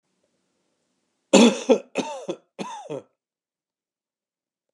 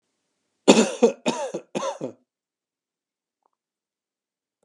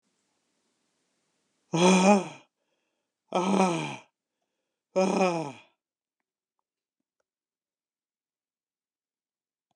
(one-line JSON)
{"three_cough_length": "4.7 s", "three_cough_amplitude": 30836, "three_cough_signal_mean_std_ratio": 0.26, "cough_length": "4.6 s", "cough_amplitude": 32178, "cough_signal_mean_std_ratio": 0.27, "exhalation_length": "9.8 s", "exhalation_amplitude": 13520, "exhalation_signal_mean_std_ratio": 0.31, "survey_phase": "alpha (2021-03-01 to 2021-08-12)", "age": "65+", "gender": "Male", "wearing_mask": "No", "symptom_cough_any": true, "symptom_new_continuous_cough": true, "symptom_onset": "8 days", "smoker_status": "Ex-smoker", "respiratory_condition_asthma": false, "respiratory_condition_other": false, "recruitment_source": "Test and Trace", "submission_delay": "2 days", "covid_test_result": "Positive", "covid_test_method": "RT-qPCR", "covid_ct_value": 19.3, "covid_ct_gene": "ORF1ab gene"}